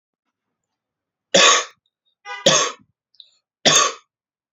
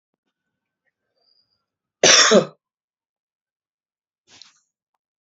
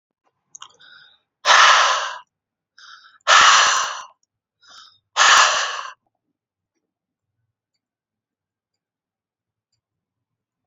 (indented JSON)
{
  "three_cough_length": "4.5 s",
  "three_cough_amplitude": 32767,
  "three_cough_signal_mean_std_ratio": 0.34,
  "cough_length": "5.2 s",
  "cough_amplitude": 30713,
  "cough_signal_mean_std_ratio": 0.22,
  "exhalation_length": "10.7 s",
  "exhalation_amplitude": 32767,
  "exhalation_signal_mean_std_ratio": 0.33,
  "survey_phase": "beta (2021-08-13 to 2022-03-07)",
  "age": "18-44",
  "gender": "Male",
  "wearing_mask": "No",
  "symptom_sore_throat": true,
  "symptom_headache": true,
  "symptom_onset": "3 days",
  "smoker_status": "Never smoked",
  "respiratory_condition_asthma": false,
  "respiratory_condition_other": false,
  "recruitment_source": "Test and Trace",
  "submission_delay": "1 day",
  "covid_test_result": "Positive",
  "covid_test_method": "RT-qPCR",
  "covid_ct_value": 26.1,
  "covid_ct_gene": "N gene"
}